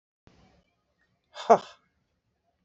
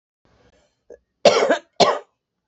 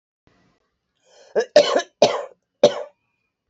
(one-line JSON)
{"exhalation_length": "2.6 s", "exhalation_amplitude": 20713, "exhalation_signal_mean_std_ratio": 0.15, "cough_length": "2.5 s", "cough_amplitude": 27817, "cough_signal_mean_std_ratio": 0.34, "three_cough_length": "3.5 s", "three_cough_amplitude": 27761, "three_cough_signal_mean_std_ratio": 0.3, "survey_phase": "beta (2021-08-13 to 2022-03-07)", "age": "45-64", "gender": "Female", "wearing_mask": "No", "symptom_cough_any": true, "symptom_shortness_of_breath": true, "symptom_fatigue": true, "symptom_headache": true, "smoker_status": "Ex-smoker", "respiratory_condition_asthma": true, "respiratory_condition_other": false, "recruitment_source": "Test and Trace", "submission_delay": "2 days", "covid_test_result": "Positive", "covid_test_method": "LAMP"}